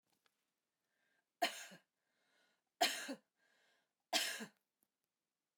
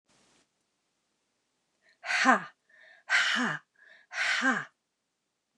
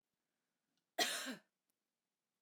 {"three_cough_length": "5.6 s", "three_cough_amplitude": 3106, "three_cough_signal_mean_std_ratio": 0.27, "exhalation_length": "5.6 s", "exhalation_amplitude": 13352, "exhalation_signal_mean_std_ratio": 0.38, "cough_length": "2.4 s", "cough_amplitude": 3291, "cough_signal_mean_std_ratio": 0.28, "survey_phase": "alpha (2021-03-01 to 2021-08-12)", "age": "45-64", "gender": "Female", "wearing_mask": "No", "symptom_none": true, "smoker_status": "Never smoked", "respiratory_condition_asthma": false, "respiratory_condition_other": false, "recruitment_source": "REACT", "submission_delay": "1 day", "covid_test_result": "Negative", "covid_test_method": "RT-qPCR"}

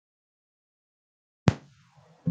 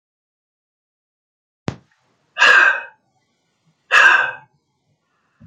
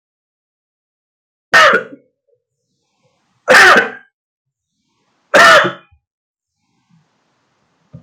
{"cough_length": "2.3 s", "cough_amplitude": 23440, "cough_signal_mean_std_ratio": 0.14, "exhalation_length": "5.5 s", "exhalation_amplitude": 32092, "exhalation_signal_mean_std_ratio": 0.31, "three_cough_length": "8.0 s", "three_cough_amplitude": 32768, "three_cough_signal_mean_std_ratio": 0.31, "survey_phase": "beta (2021-08-13 to 2022-03-07)", "age": "65+", "gender": "Male", "wearing_mask": "No", "symptom_none": true, "smoker_status": "Ex-smoker", "respiratory_condition_asthma": false, "respiratory_condition_other": false, "recruitment_source": "REACT", "submission_delay": "2 days", "covid_test_result": "Negative", "covid_test_method": "RT-qPCR"}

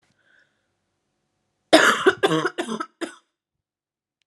{"cough_length": "4.3 s", "cough_amplitude": 31850, "cough_signal_mean_std_ratio": 0.31, "survey_phase": "alpha (2021-03-01 to 2021-08-12)", "age": "18-44", "gender": "Female", "wearing_mask": "No", "symptom_new_continuous_cough": true, "symptom_fatigue": true, "symptom_fever_high_temperature": true, "symptom_headache": true, "symptom_change_to_sense_of_smell_or_taste": true, "symptom_loss_of_taste": true, "symptom_onset": "3 days", "smoker_status": "Never smoked", "respiratory_condition_asthma": false, "respiratory_condition_other": false, "recruitment_source": "Test and Trace", "submission_delay": "1 day", "covid_test_result": "Positive", "covid_test_method": "RT-qPCR", "covid_ct_value": 16.3, "covid_ct_gene": "ORF1ab gene", "covid_ct_mean": 16.6, "covid_viral_load": "3600000 copies/ml", "covid_viral_load_category": "High viral load (>1M copies/ml)"}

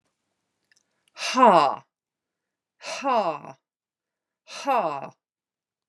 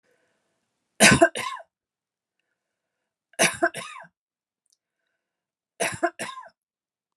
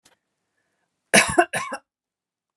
{"exhalation_length": "5.9 s", "exhalation_amplitude": 25165, "exhalation_signal_mean_std_ratio": 0.33, "three_cough_length": "7.2 s", "three_cough_amplitude": 28108, "three_cough_signal_mean_std_ratio": 0.25, "cough_length": "2.6 s", "cough_amplitude": 32756, "cough_signal_mean_std_ratio": 0.28, "survey_phase": "alpha (2021-03-01 to 2021-08-12)", "age": "45-64", "gender": "Female", "wearing_mask": "No", "symptom_none": true, "smoker_status": "Never smoked", "respiratory_condition_asthma": false, "respiratory_condition_other": false, "recruitment_source": "REACT", "submission_delay": "1 day", "covid_test_result": "Negative", "covid_test_method": "RT-qPCR"}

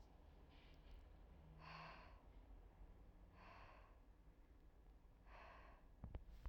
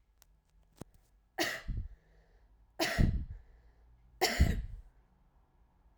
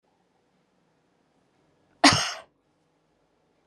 {"exhalation_length": "6.5 s", "exhalation_amplitude": 295, "exhalation_signal_mean_std_ratio": 0.95, "three_cough_length": "6.0 s", "three_cough_amplitude": 8432, "three_cough_signal_mean_std_ratio": 0.37, "cough_length": "3.7 s", "cough_amplitude": 25045, "cough_signal_mean_std_ratio": 0.19, "survey_phase": "alpha (2021-03-01 to 2021-08-12)", "age": "18-44", "gender": "Female", "wearing_mask": "No", "symptom_fatigue": true, "symptom_change_to_sense_of_smell_or_taste": true, "symptom_loss_of_taste": true, "smoker_status": "Never smoked", "respiratory_condition_asthma": false, "respiratory_condition_other": false, "recruitment_source": "Test and Trace", "submission_delay": "2 days", "covid_test_result": "Positive", "covid_test_method": "RT-qPCR"}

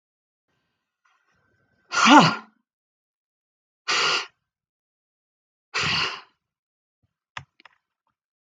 {"exhalation_length": "8.5 s", "exhalation_amplitude": 32768, "exhalation_signal_mean_std_ratio": 0.25, "survey_phase": "beta (2021-08-13 to 2022-03-07)", "age": "65+", "gender": "Female", "wearing_mask": "No", "symptom_sore_throat": true, "symptom_onset": "13 days", "smoker_status": "Ex-smoker", "respiratory_condition_asthma": false, "respiratory_condition_other": false, "recruitment_source": "REACT", "submission_delay": "3 days", "covid_test_result": "Negative", "covid_test_method": "RT-qPCR"}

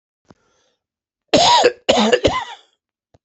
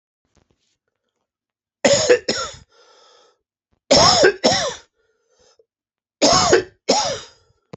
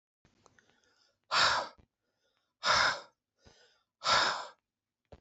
{"cough_length": "3.2 s", "cough_amplitude": 31068, "cough_signal_mean_std_ratio": 0.43, "three_cough_length": "7.8 s", "three_cough_amplitude": 30421, "three_cough_signal_mean_std_ratio": 0.4, "exhalation_length": "5.2 s", "exhalation_amplitude": 7113, "exhalation_signal_mean_std_ratio": 0.37, "survey_phase": "beta (2021-08-13 to 2022-03-07)", "age": "45-64", "gender": "Male", "wearing_mask": "No", "symptom_cough_any": true, "symptom_runny_or_blocked_nose": true, "symptom_diarrhoea": true, "symptom_fatigue": true, "symptom_headache": true, "symptom_change_to_sense_of_smell_or_taste": true, "smoker_status": "Never smoked", "respiratory_condition_asthma": false, "respiratory_condition_other": false, "recruitment_source": "Test and Trace", "submission_delay": "2 days", "covid_test_result": "Positive", "covid_test_method": "LFT"}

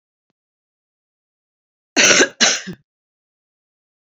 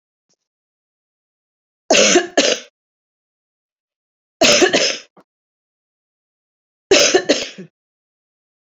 {"cough_length": "4.1 s", "cough_amplitude": 32373, "cough_signal_mean_std_ratio": 0.28, "three_cough_length": "8.7 s", "three_cough_amplitude": 32768, "three_cough_signal_mean_std_ratio": 0.33, "survey_phase": "beta (2021-08-13 to 2022-03-07)", "age": "45-64", "gender": "Female", "wearing_mask": "No", "symptom_runny_or_blocked_nose": true, "symptom_headache": true, "symptom_onset": "12 days", "smoker_status": "Never smoked", "respiratory_condition_asthma": false, "respiratory_condition_other": false, "recruitment_source": "REACT", "submission_delay": "1 day", "covid_test_result": "Negative", "covid_test_method": "RT-qPCR", "influenza_a_test_result": "Negative", "influenza_b_test_result": "Negative"}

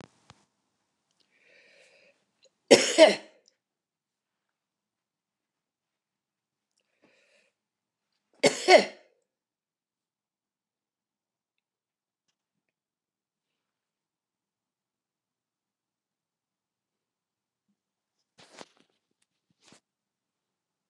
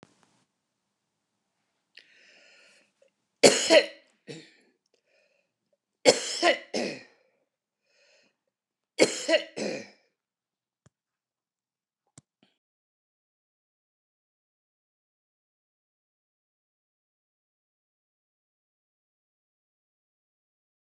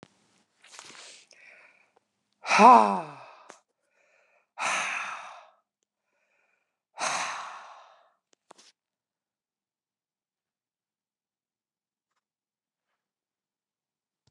{"cough_length": "20.9 s", "cough_amplitude": 26465, "cough_signal_mean_std_ratio": 0.13, "three_cough_length": "20.9 s", "three_cough_amplitude": 28112, "three_cough_signal_mean_std_ratio": 0.18, "exhalation_length": "14.3 s", "exhalation_amplitude": 26118, "exhalation_signal_mean_std_ratio": 0.2, "survey_phase": "beta (2021-08-13 to 2022-03-07)", "age": "65+", "gender": "Female", "wearing_mask": "No", "symptom_cough_any": true, "smoker_status": "Never smoked", "respiratory_condition_asthma": false, "respiratory_condition_other": false, "recruitment_source": "REACT", "submission_delay": "0 days", "covid_test_result": "Negative", "covid_test_method": "RT-qPCR"}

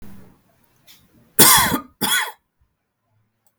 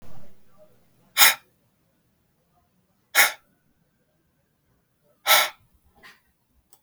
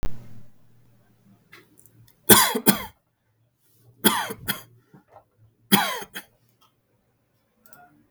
{"cough_length": "3.6 s", "cough_amplitude": 32768, "cough_signal_mean_std_ratio": 0.33, "exhalation_length": "6.8 s", "exhalation_amplitude": 32768, "exhalation_signal_mean_std_ratio": 0.25, "three_cough_length": "8.1 s", "three_cough_amplitude": 32768, "three_cough_signal_mean_std_ratio": 0.28, "survey_phase": "beta (2021-08-13 to 2022-03-07)", "age": "45-64", "gender": "Male", "wearing_mask": "No", "symptom_none": true, "smoker_status": "Never smoked", "respiratory_condition_asthma": false, "respiratory_condition_other": false, "recruitment_source": "REACT", "submission_delay": "2 days", "covid_test_result": "Negative", "covid_test_method": "RT-qPCR"}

